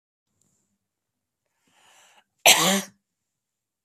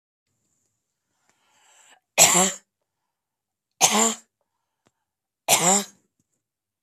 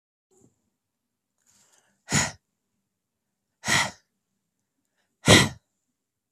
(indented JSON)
{
  "cough_length": "3.8 s",
  "cough_amplitude": 32460,
  "cough_signal_mean_std_ratio": 0.22,
  "three_cough_length": "6.8 s",
  "three_cough_amplitude": 30656,
  "three_cough_signal_mean_std_ratio": 0.29,
  "exhalation_length": "6.3 s",
  "exhalation_amplitude": 25484,
  "exhalation_signal_mean_std_ratio": 0.22,
  "survey_phase": "beta (2021-08-13 to 2022-03-07)",
  "age": "18-44",
  "gender": "Female",
  "wearing_mask": "No",
  "symptom_none": true,
  "smoker_status": "Ex-smoker",
  "respiratory_condition_asthma": false,
  "respiratory_condition_other": false,
  "recruitment_source": "REACT",
  "submission_delay": "2 days",
  "covid_test_result": "Negative",
  "covid_test_method": "RT-qPCR",
  "influenza_a_test_result": "Negative",
  "influenza_b_test_result": "Negative"
}